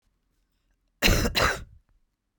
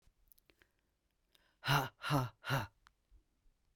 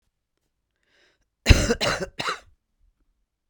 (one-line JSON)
{"cough_length": "2.4 s", "cough_amplitude": 19332, "cough_signal_mean_std_ratio": 0.38, "exhalation_length": "3.8 s", "exhalation_amplitude": 4047, "exhalation_signal_mean_std_ratio": 0.34, "three_cough_length": "3.5 s", "three_cough_amplitude": 32767, "three_cough_signal_mean_std_ratio": 0.26, "survey_phase": "beta (2021-08-13 to 2022-03-07)", "age": "45-64", "gender": "Female", "wearing_mask": "No", "symptom_cough_any": true, "symptom_fatigue": true, "symptom_headache": true, "symptom_onset": "7 days", "smoker_status": "Ex-smoker", "respiratory_condition_asthma": false, "respiratory_condition_other": false, "recruitment_source": "REACT", "submission_delay": "10 days", "covid_test_result": "Negative", "covid_test_method": "RT-qPCR", "influenza_a_test_result": "Negative", "influenza_b_test_result": "Negative"}